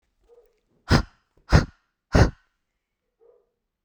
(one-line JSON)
{"exhalation_length": "3.8 s", "exhalation_amplitude": 24879, "exhalation_signal_mean_std_ratio": 0.25, "survey_phase": "beta (2021-08-13 to 2022-03-07)", "age": "18-44", "gender": "Female", "wearing_mask": "No", "symptom_none": true, "symptom_onset": "12 days", "smoker_status": "Ex-smoker", "respiratory_condition_asthma": false, "respiratory_condition_other": false, "recruitment_source": "REACT", "submission_delay": "0 days", "covid_test_result": "Negative", "covid_test_method": "RT-qPCR"}